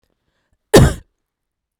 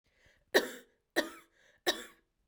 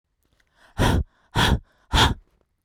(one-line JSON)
{"cough_length": "1.8 s", "cough_amplitude": 32768, "cough_signal_mean_std_ratio": 0.26, "three_cough_length": "2.5 s", "three_cough_amplitude": 9608, "three_cough_signal_mean_std_ratio": 0.28, "exhalation_length": "2.6 s", "exhalation_amplitude": 17790, "exhalation_signal_mean_std_ratio": 0.43, "survey_phase": "beta (2021-08-13 to 2022-03-07)", "age": "18-44", "gender": "Female", "wearing_mask": "No", "symptom_none": true, "smoker_status": "Never smoked", "respiratory_condition_asthma": true, "respiratory_condition_other": false, "recruitment_source": "REACT", "submission_delay": "2 days", "covid_test_result": "Negative", "covid_test_method": "RT-qPCR"}